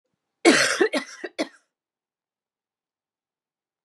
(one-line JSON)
{"cough_length": "3.8 s", "cough_amplitude": 26828, "cough_signal_mean_std_ratio": 0.29, "survey_phase": "beta (2021-08-13 to 2022-03-07)", "age": "45-64", "gender": "Female", "wearing_mask": "No", "symptom_cough_any": true, "symptom_runny_or_blocked_nose": true, "symptom_fatigue": true, "symptom_headache": true, "symptom_change_to_sense_of_smell_or_taste": true, "symptom_onset": "10 days", "smoker_status": "Never smoked", "respiratory_condition_asthma": false, "respiratory_condition_other": false, "recruitment_source": "REACT", "submission_delay": "1 day", "covid_test_result": "Positive", "covid_test_method": "RT-qPCR", "covid_ct_value": 27.0, "covid_ct_gene": "E gene", "influenza_a_test_result": "Negative", "influenza_b_test_result": "Negative"}